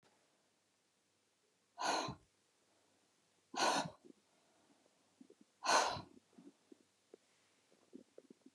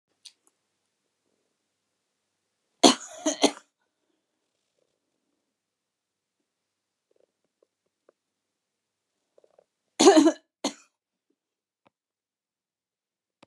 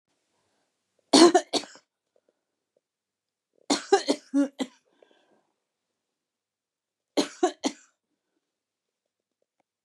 {"exhalation_length": "8.5 s", "exhalation_amplitude": 3333, "exhalation_signal_mean_std_ratio": 0.29, "cough_length": "13.5 s", "cough_amplitude": 29829, "cough_signal_mean_std_ratio": 0.16, "three_cough_length": "9.8 s", "three_cough_amplitude": 25097, "three_cough_signal_mean_std_ratio": 0.22, "survey_phase": "beta (2021-08-13 to 2022-03-07)", "age": "65+", "gender": "Female", "wearing_mask": "No", "symptom_runny_or_blocked_nose": true, "smoker_status": "Ex-smoker", "respiratory_condition_asthma": true, "respiratory_condition_other": false, "recruitment_source": "REACT", "submission_delay": "2 days", "covid_test_result": "Negative", "covid_test_method": "RT-qPCR", "influenza_a_test_result": "Negative", "influenza_b_test_result": "Negative"}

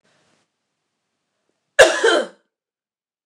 {"cough_length": "3.3 s", "cough_amplitude": 29204, "cough_signal_mean_std_ratio": 0.26, "survey_phase": "beta (2021-08-13 to 2022-03-07)", "age": "45-64", "gender": "Female", "wearing_mask": "No", "symptom_runny_or_blocked_nose": true, "symptom_loss_of_taste": true, "smoker_status": "Never smoked", "respiratory_condition_asthma": true, "respiratory_condition_other": false, "recruitment_source": "Test and Trace", "submission_delay": "1 day", "covid_test_result": "Positive", "covid_test_method": "RT-qPCR", "covid_ct_value": 17.7, "covid_ct_gene": "ORF1ab gene", "covid_ct_mean": 18.3, "covid_viral_load": "970000 copies/ml", "covid_viral_load_category": "Low viral load (10K-1M copies/ml)"}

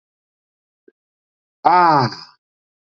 {"exhalation_length": "2.9 s", "exhalation_amplitude": 26818, "exhalation_signal_mean_std_ratio": 0.32, "survey_phase": "beta (2021-08-13 to 2022-03-07)", "age": "45-64", "gender": "Male", "wearing_mask": "No", "symptom_none": true, "smoker_status": "Ex-smoker", "respiratory_condition_asthma": false, "respiratory_condition_other": false, "recruitment_source": "REACT", "submission_delay": "0 days", "covid_test_method": "RT-qPCR"}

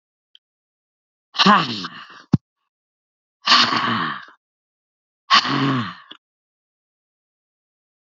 {"exhalation_length": "8.2 s", "exhalation_amplitude": 31034, "exhalation_signal_mean_std_ratio": 0.34, "survey_phase": "beta (2021-08-13 to 2022-03-07)", "age": "65+", "gender": "Female", "wearing_mask": "No", "symptom_none": true, "smoker_status": "Ex-smoker", "respiratory_condition_asthma": false, "respiratory_condition_other": false, "recruitment_source": "REACT", "submission_delay": "0 days", "covid_test_result": "Negative", "covid_test_method": "RT-qPCR", "influenza_a_test_result": "Negative", "influenza_b_test_result": "Negative"}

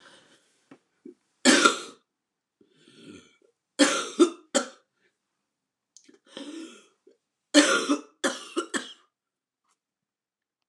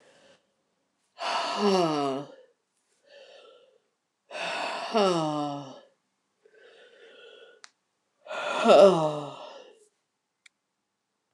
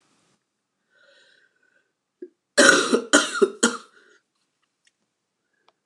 {"three_cough_length": "10.7 s", "three_cough_amplitude": 26914, "three_cough_signal_mean_std_ratio": 0.29, "exhalation_length": "11.3 s", "exhalation_amplitude": 17616, "exhalation_signal_mean_std_ratio": 0.36, "cough_length": "5.9 s", "cough_amplitude": 29204, "cough_signal_mean_std_ratio": 0.28, "survey_phase": "beta (2021-08-13 to 2022-03-07)", "age": "45-64", "gender": "Female", "wearing_mask": "No", "symptom_cough_any": true, "symptom_runny_or_blocked_nose": true, "symptom_shortness_of_breath": true, "symptom_sore_throat": true, "symptom_fatigue": true, "symptom_headache": true, "smoker_status": "Ex-smoker", "respiratory_condition_asthma": false, "respiratory_condition_other": false, "recruitment_source": "Test and Trace", "submission_delay": "2 days", "covid_test_result": "Positive", "covid_test_method": "RT-qPCR", "covid_ct_value": 15.5, "covid_ct_gene": "ORF1ab gene"}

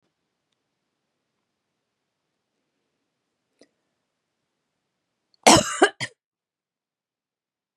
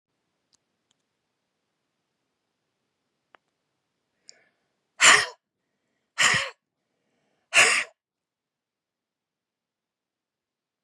{"cough_length": "7.8 s", "cough_amplitude": 32767, "cough_signal_mean_std_ratio": 0.15, "exhalation_length": "10.8 s", "exhalation_amplitude": 28814, "exhalation_signal_mean_std_ratio": 0.2, "survey_phase": "beta (2021-08-13 to 2022-03-07)", "age": "45-64", "gender": "Female", "wearing_mask": "No", "symptom_none": true, "smoker_status": "Ex-smoker", "respiratory_condition_asthma": false, "respiratory_condition_other": false, "recruitment_source": "Test and Trace", "submission_delay": "1 day", "covid_test_result": "Positive", "covid_test_method": "ePCR"}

